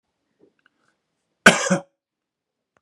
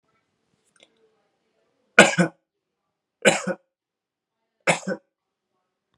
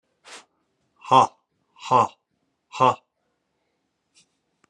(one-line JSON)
{"cough_length": "2.8 s", "cough_amplitude": 32768, "cough_signal_mean_std_ratio": 0.2, "three_cough_length": "6.0 s", "three_cough_amplitude": 32768, "three_cough_signal_mean_std_ratio": 0.21, "exhalation_length": "4.7 s", "exhalation_amplitude": 25579, "exhalation_signal_mean_std_ratio": 0.25, "survey_phase": "beta (2021-08-13 to 2022-03-07)", "age": "18-44", "gender": "Male", "wearing_mask": "No", "symptom_none": true, "smoker_status": "Never smoked", "respiratory_condition_asthma": false, "respiratory_condition_other": false, "recruitment_source": "REACT", "submission_delay": "2 days", "covid_test_result": "Negative", "covid_test_method": "RT-qPCR"}